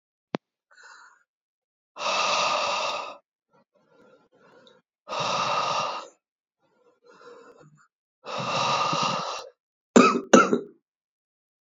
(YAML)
exhalation_length: 11.6 s
exhalation_amplitude: 28387
exhalation_signal_mean_std_ratio: 0.39
survey_phase: beta (2021-08-13 to 2022-03-07)
age: 18-44
gender: Male
wearing_mask: 'No'
symptom_cough_any: true
symptom_runny_or_blocked_nose: true
symptom_sore_throat: true
symptom_fatigue: true
symptom_headache: true
symptom_other: true
smoker_status: Never smoked
respiratory_condition_asthma: false
respiratory_condition_other: false
recruitment_source: Test and Trace
submission_delay: 1 day
covid_test_result: Positive
covid_test_method: ePCR